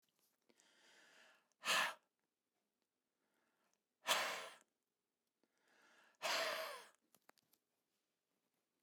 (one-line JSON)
{"exhalation_length": "8.8 s", "exhalation_amplitude": 2422, "exhalation_signal_mean_std_ratio": 0.3, "survey_phase": "beta (2021-08-13 to 2022-03-07)", "age": "45-64", "gender": "Male", "wearing_mask": "No", "symptom_none": true, "smoker_status": "Never smoked", "respiratory_condition_asthma": true, "respiratory_condition_other": false, "recruitment_source": "REACT", "submission_delay": "0 days", "covid_test_result": "Negative", "covid_test_method": "RT-qPCR"}